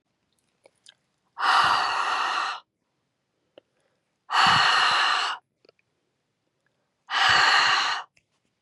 {"exhalation_length": "8.6 s", "exhalation_amplitude": 14813, "exhalation_signal_mean_std_ratio": 0.51, "survey_phase": "beta (2021-08-13 to 2022-03-07)", "age": "18-44", "gender": "Female", "wearing_mask": "No", "symptom_none": true, "smoker_status": "Ex-smoker", "respiratory_condition_asthma": true, "respiratory_condition_other": false, "recruitment_source": "REACT", "submission_delay": "4 days", "covid_test_result": "Negative", "covid_test_method": "RT-qPCR"}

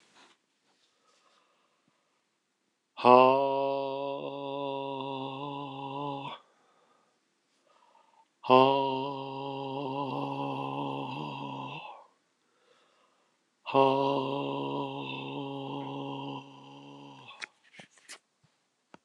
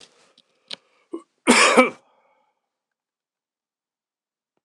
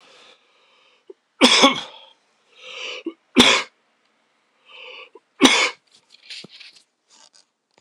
{"exhalation_length": "19.0 s", "exhalation_amplitude": 20779, "exhalation_signal_mean_std_ratio": 0.4, "cough_length": "4.6 s", "cough_amplitude": 26028, "cough_signal_mean_std_ratio": 0.24, "three_cough_length": "7.8 s", "three_cough_amplitude": 26028, "three_cough_signal_mean_std_ratio": 0.29, "survey_phase": "beta (2021-08-13 to 2022-03-07)", "age": "45-64", "gender": "Male", "wearing_mask": "No", "symptom_cough_any": true, "symptom_runny_or_blocked_nose": true, "symptom_sore_throat": true, "symptom_fatigue": true, "symptom_fever_high_temperature": true, "symptom_headache": true, "symptom_onset": "2 days", "smoker_status": "Never smoked", "respiratory_condition_asthma": false, "respiratory_condition_other": false, "recruitment_source": "Test and Trace", "submission_delay": "1 day", "covid_test_result": "Positive", "covid_test_method": "RT-qPCR", "covid_ct_value": 22.1, "covid_ct_gene": "ORF1ab gene", "covid_ct_mean": 22.8, "covid_viral_load": "34000 copies/ml", "covid_viral_load_category": "Low viral load (10K-1M copies/ml)"}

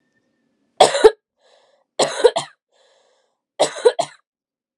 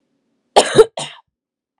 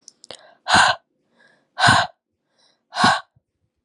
{"three_cough_length": "4.8 s", "three_cough_amplitude": 32768, "three_cough_signal_mean_std_ratio": 0.28, "cough_length": "1.8 s", "cough_amplitude": 32768, "cough_signal_mean_std_ratio": 0.28, "exhalation_length": "3.8 s", "exhalation_amplitude": 29626, "exhalation_signal_mean_std_ratio": 0.36, "survey_phase": "alpha (2021-03-01 to 2021-08-12)", "age": "18-44", "gender": "Female", "wearing_mask": "No", "symptom_none": true, "smoker_status": "Ex-smoker", "respiratory_condition_asthma": false, "respiratory_condition_other": false, "recruitment_source": "Test and Trace", "submission_delay": "2 days", "covid_test_result": "Positive", "covid_test_method": "RT-qPCR"}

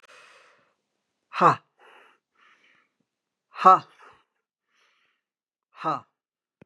{"exhalation_length": "6.7 s", "exhalation_amplitude": 28761, "exhalation_signal_mean_std_ratio": 0.19, "survey_phase": "beta (2021-08-13 to 2022-03-07)", "age": "65+", "gender": "Female", "wearing_mask": "No", "symptom_none": true, "smoker_status": "Ex-smoker", "respiratory_condition_asthma": false, "respiratory_condition_other": false, "recruitment_source": "REACT", "submission_delay": "1 day", "covid_test_result": "Negative", "covid_test_method": "RT-qPCR", "influenza_a_test_result": "Negative", "influenza_b_test_result": "Negative"}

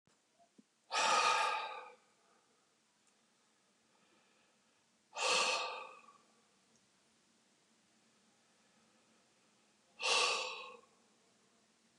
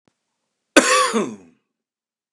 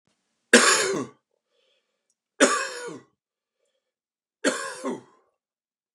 {"exhalation_length": "12.0 s", "exhalation_amplitude": 3531, "exhalation_signal_mean_std_ratio": 0.35, "cough_length": "2.3 s", "cough_amplitude": 32767, "cough_signal_mean_std_ratio": 0.34, "three_cough_length": "5.9 s", "three_cough_amplitude": 31457, "three_cough_signal_mean_std_ratio": 0.31, "survey_phase": "beta (2021-08-13 to 2022-03-07)", "age": "65+", "gender": "Male", "wearing_mask": "No", "symptom_none": true, "smoker_status": "Never smoked", "respiratory_condition_asthma": false, "respiratory_condition_other": false, "recruitment_source": "REACT", "submission_delay": "1 day", "covid_test_result": "Negative", "covid_test_method": "RT-qPCR"}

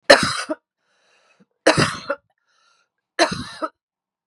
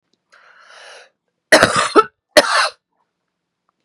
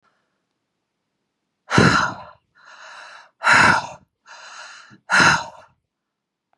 {"three_cough_length": "4.3 s", "three_cough_amplitude": 32768, "three_cough_signal_mean_std_ratio": 0.31, "cough_length": "3.8 s", "cough_amplitude": 32768, "cough_signal_mean_std_ratio": 0.32, "exhalation_length": "6.6 s", "exhalation_amplitude": 31678, "exhalation_signal_mean_std_ratio": 0.35, "survey_phase": "beta (2021-08-13 to 2022-03-07)", "age": "45-64", "gender": "Female", "wearing_mask": "No", "symptom_fatigue": true, "smoker_status": "Ex-smoker", "respiratory_condition_asthma": false, "respiratory_condition_other": false, "recruitment_source": "REACT", "submission_delay": "1 day", "covid_test_result": "Negative", "covid_test_method": "RT-qPCR"}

